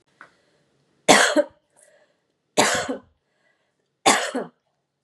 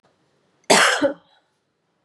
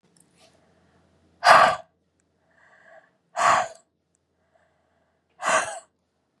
{"three_cough_length": "5.0 s", "three_cough_amplitude": 32767, "three_cough_signal_mean_std_ratio": 0.33, "cough_length": "2.0 s", "cough_amplitude": 29843, "cough_signal_mean_std_ratio": 0.35, "exhalation_length": "6.4 s", "exhalation_amplitude": 29901, "exhalation_signal_mean_std_ratio": 0.28, "survey_phase": "beta (2021-08-13 to 2022-03-07)", "age": "45-64", "gender": "Female", "wearing_mask": "No", "symptom_none": true, "smoker_status": "Ex-smoker", "respiratory_condition_asthma": false, "respiratory_condition_other": false, "recruitment_source": "Test and Trace", "submission_delay": "1 day", "covid_test_result": "Negative", "covid_test_method": "RT-qPCR"}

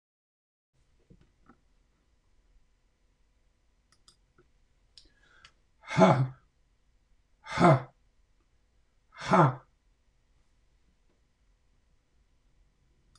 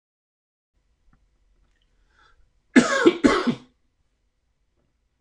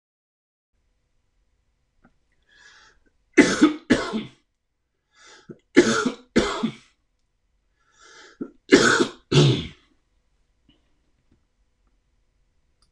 {"exhalation_length": "13.2 s", "exhalation_amplitude": 12834, "exhalation_signal_mean_std_ratio": 0.21, "cough_length": "5.2 s", "cough_amplitude": 25448, "cough_signal_mean_std_ratio": 0.25, "three_cough_length": "12.9 s", "three_cough_amplitude": 26028, "three_cough_signal_mean_std_ratio": 0.29, "survey_phase": "beta (2021-08-13 to 2022-03-07)", "age": "65+", "gender": "Male", "wearing_mask": "No", "symptom_none": true, "smoker_status": "Never smoked", "respiratory_condition_asthma": false, "respiratory_condition_other": false, "recruitment_source": "REACT", "submission_delay": "2 days", "covid_test_result": "Negative", "covid_test_method": "RT-qPCR", "influenza_a_test_result": "Negative", "influenza_b_test_result": "Negative"}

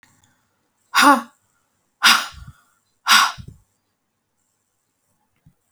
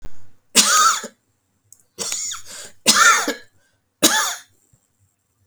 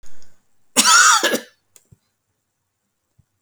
{"exhalation_length": "5.7 s", "exhalation_amplitude": 32767, "exhalation_signal_mean_std_ratio": 0.28, "three_cough_length": "5.5 s", "three_cough_amplitude": 32768, "three_cough_signal_mean_std_ratio": 0.45, "cough_length": "3.4 s", "cough_amplitude": 32768, "cough_signal_mean_std_ratio": 0.39, "survey_phase": "beta (2021-08-13 to 2022-03-07)", "age": "45-64", "gender": "Female", "wearing_mask": "No", "symptom_none": true, "smoker_status": "Never smoked", "respiratory_condition_asthma": true, "respiratory_condition_other": false, "recruitment_source": "REACT", "submission_delay": "2 days", "covid_test_result": "Negative", "covid_test_method": "RT-qPCR"}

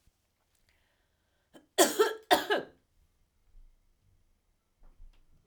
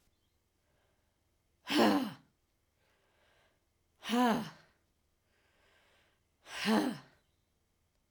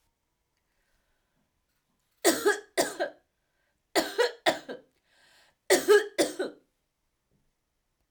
{"cough_length": "5.5 s", "cough_amplitude": 14205, "cough_signal_mean_std_ratio": 0.25, "exhalation_length": "8.1 s", "exhalation_amplitude": 5704, "exhalation_signal_mean_std_ratio": 0.31, "three_cough_length": "8.1 s", "three_cough_amplitude": 12674, "three_cough_signal_mean_std_ratio": 0.31, "survey_phase": "beta (2021-08-13 to 2022-03-07)", "age": "45-64", "gender": "Female", "wearing_mask": "Yes", "symptom_runny_or_blocked_nose": true, "symptom_fever_high_temperature": true, "symptom_headache": true, "smoker_status": "Never smoked", "respiratory_condition_asthma": false, "respiratory_condition_other": false, "recruitment_source": "Test and Trace", "submission_delay": "1 day", "covid_test_result": "Positive", "covid_test_method": "RT-qPCR", "covid_ct_value": 13.5, "covid_ct_gene": "N gene"}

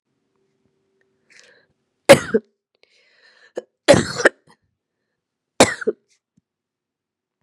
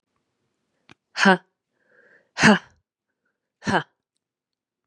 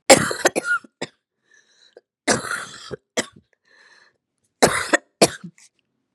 {"three_cough_length": "7.4 s", "three_cough_amplitude": 32768, "three_cough_signal_mean_std_ratio": 0.2, "exhalation_length": "4.9 s", "exhalation_amplitude": 29160, "exhalation_signal_mean_std_ratio": 0.23, "cough_length": "6.1 s", "cough_amplitude": 32768, "cough_signal_mean_std_ratio": 0.3, "survey_phase": "beta (2021-08-13 to 2022-03-07)", "age": "18-44", "gender": "Female", "wearing_mask": "No", "symptom_cough_any": true, "symptom_new_continuous_cough": true, "symptom_runny_or_blocked_nose": true, "symptom_sore_throat": true, "symptom_fatigue": true, "symptom_onset": "4 days", "smoker_status": "Never smoked", "respiratory_condition_asthma": false, "respiratory_condition_other": false, "recruitment_source": "Test and Trace", "submission_delay": "1 day", "covid_test_result": "Positive", "covid_test_method": "RT-qPCR", "covid_ct_value": 30.0, "covid_ct_gene": "N gene"}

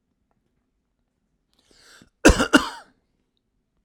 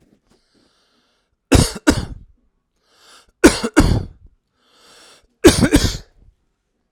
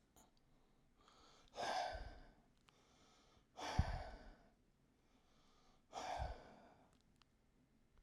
{"cough_length": "3.8 s", "cough_amplitude": 32768, "cough_signal_mean_std_ratio": 0.2, "three_cough_length": "6.9 s", "three_cough_amplitude": 32768, "three_cough_signal_mean_std_ratio": 0.31, "exhalation_length": "8.0 s", "exhalation_amplitude": 2581, "exhalation_signal_mean_std_ratio": 0.39, "survey_phase": "alpha (2021-03-01 to 2021-08-12)", "age": "18-44", "gender": "Male", "wearing_mask": "No", "symptom_none": true, "smoker_status": "Never smoked", "respiratory_condition_asthma": false, "respiratory_condition_other": false, "recruitment_source": "REACT", "submission_delay": "5 days", "covid_test_result": "Negative", "covid_test_method": "RT-qPCR"}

